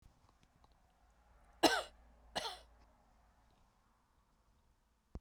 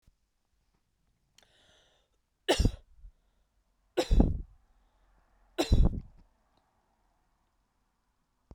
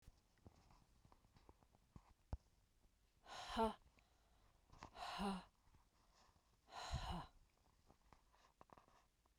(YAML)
cough_length: 5.2 s
cough_amplitude: 6542
cough_signal_mean_std_ratio: 0.21
three_cough_length: 8.5 s
three_cough_amplitude: 11732
three_cough_signal_mean_std_ratio: 0.25
exhalation_length: 9.4 s
exhalation_amplitude: 1049
exhalation_signal_mean_std_ratio: 0.35
survey_phase: beta (2021-08-13 to 2022-03-07)
age: 45-64
gender: Female
wearing_mask: 'No'
symptom_none: true
smoker_status: Never smoked
respiratory_condition_asthma: false
respiratory_condition_other: false
recruitment_source: REACT
submission_delay: 1 day
covid_test_result: Negative
covid_test_method: RT-qPCR